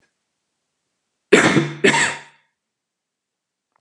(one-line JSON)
{"cough_length": "3.8 s", "cough_amplitude": 32768, "cough_signal_mean_std_ratio": 0.32, "survey_phase": "beta (2021-08-13 to 2022-03-07)", "age": "45-64", "gender": "Male", "wearing_mask": "No", "symptom_none": true, "symptom_onset": "8 days", "smoker_status": "Never smoked", "respiratory_condition_asthma": false, "respiratory_condition_other": false, "recruitment_source": "REACT", "submission_delay": "1 day", "covid_test_result": "Negative", "covid_test_method": "RT-qPCR", "influenza_a_test_result": "Negative", "influenza_b_test_result": "Negative"}